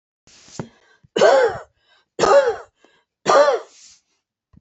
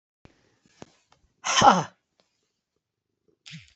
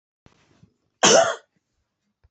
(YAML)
three_cough_length: 4.6 s
three_cough_amplitude: 26721
three_cough_signal_mean_std_ratio: 0.41
exhalation_length: 3.8 s
exhalation_amplitude: 23910
exhalation_signal_mean_std_ratio: 0.23
cough_length: 2.3 s
cough_amplitude: 26317
cough_signal_mean_std_ratio: 0.29
survey_phase: beta (2021-08-13 to 2022-03-07)
age: 45-64
gender: Female
wearing_mask: 'No'
symptom_none: true
smoker_status: Ex-smoker
respiratory_condition_asthma: false
respiratory_condition_other: false
recruitment_source: REACT
submission_delay: 1 day
covid_test_result: Negative
covid_test_method: RT-qPCR